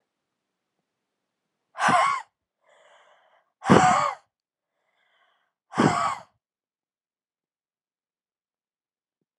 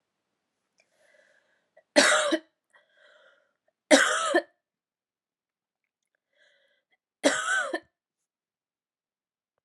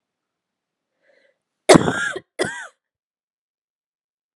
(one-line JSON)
{"exhalation_length": "9.4 s", "exhalation_amplitude": 29058, "exhalation_signal_mean_std_ratio": 0.28, "three_cough_length": "9.6 s", "three_cough_amplitude": 26573, "three_cough_signal_mean_std_ratio": 0.28, "cough_length": "4.4 s", "cough_amplitude": 32768, "cough_signal_mean_std_ratio": 0.21, "survey_phase": "alpha (2021-03-01 to 2021-08-12)", "age": "18-44", "gender": "Female", "wearing_mask": "No", "symptom_fatigue": true, "symptom_fever_high_temperature": true, "symptom_headache": true, "symptom_onset": "2 days", "smoker_status": "Never smoked", "respiratory_condition_asthma": false, "respiratory_condition_other": false, "recruitment_source": "Test and Trace", "submission_delay": "2 days", "covid_test_result": "Positive", "covid_test_method": "RT-qPCR", "covid_ct_value": 16.8, "covid_ct_gene": "ORF1ab gene", "covid_ct_mean": 17.0, "covid_viral_load": "2700000 copies/ml", "covid_viral_load_category": "High viral load (>1M copies/ml)"}